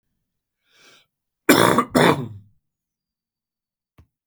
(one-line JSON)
{"cough_length": "4.3 s", "cough_amplitude": 32768, "cough_signal_mean_std_ratio": 0.3, "survey_phase": "beta (2021-08-13 to 2022-03-07)", "age": "45-64", "gender": "Male", "wearing_mask": "No", "symptom_cough_any": true, "symptom_runny_or_blocked_nose": true, "symptom_shortness_of_breath": true, "symptom_sore_throat": true, "symptom_fatigue": true, "symptom_onset": "3 days", "smoker_status": "Never smoked", "respiratory_condition_asthma": false, "respiratory_condition_other": false, "recruitment_source": "Test and Trace", "submission_delay": "1 day", "covid_test_result": "Positive", "covid_test_method": "ePCR"}